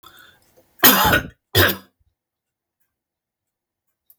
{"cough_length": "4.2 s", "cough_amplitude": 32768, "cough_signal_mean_std_ratio": 0.29, "survey_phase": "beta (2021-08-13 to 2022-03-07)", "age": "65+", "gender": "Male", "wearing_mask": "No", "symptom_none": true, "smoker_status": "Never smoked", "respiratory_condition_asthma": false, "respiratory_condition_other": false, "recruitment_source": "REACT", "submission_delay": "2 days", "covid_test_result": "Negative", "covid_test_method": "RT-qPCR", "influenza_a_test_result": "Negative", "influenza_b_test_result": "Negative"}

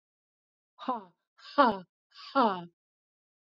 {"exhalation_length": "3.5 s", "exhalation_amplitude": 10979, "exhalation_signal_mean_std_ratio": 0.3, "survey_phase": "beta (2021-08-13 to 2022-03-07)", "age": "45-64", "gender": "Female", "wearing_mask": "No", "symptom_none": true, "smoker_status": "Never smoked", "respiratory_condition_asthma": true, "respiratory_condition_other": false, "recruitment_source": "REACT", "submission_delay": "1 day", "covid_test_result": "Negative", "covid_test_method": "RT-qPCR", "influenza_a_test_result": "Negative", "influenza_b_test_result": "Negative"}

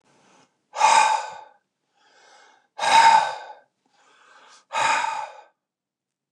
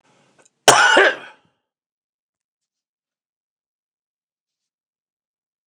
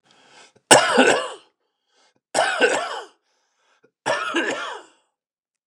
{"exhalation_length": "6.3 s", "exhalation_amplitude": 24950, "exhalation_signal_mean_std_ratio": 0.39, "cough_length": "5.7 s", "cough_amplitude": 29204, "cough_signal_mean_std_ratio": 0.23, "three_cough_length": "5.7 s", "three_cough_amplitude": 29204, "three_cough_signal_mean_std_ratio": 0.4, "survey_phase": "beta (2021-08-13 to 2022-03-07)", "age": "65+", "gender": "Male", "wearing_mask": "No", "symptom_runny_or_blocked_nose": true, "smoker_status": "Ex-smoker", "respiratory_condition_asthma": false, "respiratory_condition_other": false, "recruitment_source": "REACT", "submission_delay": "2 days", "covid_test_result": "Negative", "covid_test_method": "RT-qPCR", "influenza_a_test_result": "Negative", "influenza_b_test_result": "Negative"}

